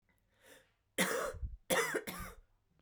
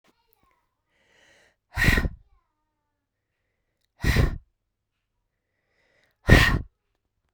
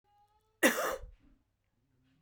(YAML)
three_cough_length: 2.8 s
three_cough_amplitude: 4125
three_cough_signal_mean_std_ratio: 0.48
exhalation_length: 7.3 s
exhalation_amplitude: 32768
exhalation_signal_mean_std_ratio: 0.26
cough_length: 2.2 s
cough_amplitude: 9886
cough_signal_mean_std_ratio: 0.29
survey_phase: beta (2021-08-13 to 2022-03-07)
age: 18-44
gender: Female
wearing_mask: 'No'
symptom_cough_any: true
symptom_runny_or_blocked_nose: true
symptom_shortness_of_breath: true
symptom_fatigue: true
symptom_headache: true
symptom_change_to_sense_of_smell_or_taste: true
symptom_loss_of_taste: true
symptom_onset: 2 days
smoker_status: Ex-smoker
respiratory_condition_asthma: true
respiratory_condition_other: false
recruitment_source: Test and Trace
submission_delay: 1 day
covid_test_result: Positive
covid_test_method: RT-qPCR
covid_ct_value: 13.3
covid_ct_gene: ORF1ab gene
covid_ct_mean: 14.1
covid_viral_load: 23000000 copies/ml
covid_viral_load_category: High viral load (>1M copies/ml)